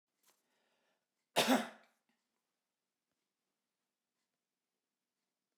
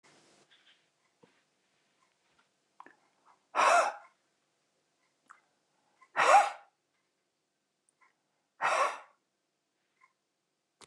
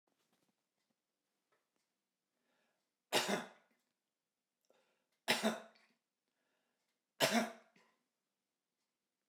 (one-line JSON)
{"cough_length": "5.6 s", "cough_amplitude": 5060, "cough_signal_mean_std_ratio": 0.17, "exhalation_length": "10.9 s", "exhalation_amplitude": 9264, "exhalation_signal_mean_std_ratio": 0.24, "three_cough_length": "9.3 s", "three_cough_amplitude": 4728, "three_cough_signal_mean_std_ratio": 0.23, "survey_phase": "beta (2021-08-13 to 2022-03-07)", "age": "65+", "gender": "Male", "wearing_mask": "No", "symptom_cough_any": true, "smoker_status": "Never smoked", "respiratory_condition_asthma": false, "respiratory_condition_other": false, "recruitment_source": "REACT", "submission_delay": "1 day", "covid_test_result": "Positive", "covid_test_method": "RT-qPCR", "covid_ct_value": 27.0, "covid_ct_gene": "E gene", "influenza_a_test_result": "Negative", "influenza_b_test_result": "Negative"}